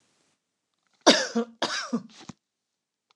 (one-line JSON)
{"cough_length": "3.2 s", "cough_amplitude": 26573, "cough_signal_mean_std_ratio": 0.3, "survey_phase": "beta (2021-08-13 to 2022-03-07)", "age": "65+", "gender": "Female", "wearing_mask": "No", "symptom_none": true, "smoker_status": "Never smoked", "respiratory_condition_asthma": false, "respiratory_condition_other": false, "recruitment_source": "REACT", "submission_delay": "2 days", "covid_test_result": "Negative", "covid_test_method": "RT-qPCR", "influenza_a_test_result": "Negative", "influenza_b_test_result": "Negative"}